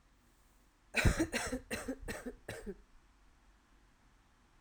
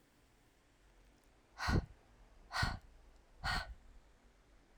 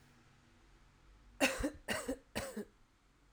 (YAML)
cough_length: 4.6 s
cough_amplitude: 5327
cough_signal_mean_std_ratio: 0.38
exhalation_length: 4.8 s
exhalation_amplitude: 2571
exhalation_signal_mean_std_ratio: 0.37
three_cough_length: 3.3 s
three_cough_amplitude: 4144
three_cough_signal_mean_std_ratio: 0.4
survey_phase: alpha (2021-03-01 to 2021-08-12)
age: 18-44
gender: Female
wearing_mask: 'No'
symptom_headache: true
symptom_onset: 5 days
smoker_status: Ex-smoker
respiratory_condition_asthma: true
respiratory_condition_other: false
recruitment_source: Test and Trace
submission_delay: 3 days
covid_test_result: Positive
covid_test_method: RT-qPCR
covid_ct_value: 21.0
covid_ct_gene: ORF1ab gene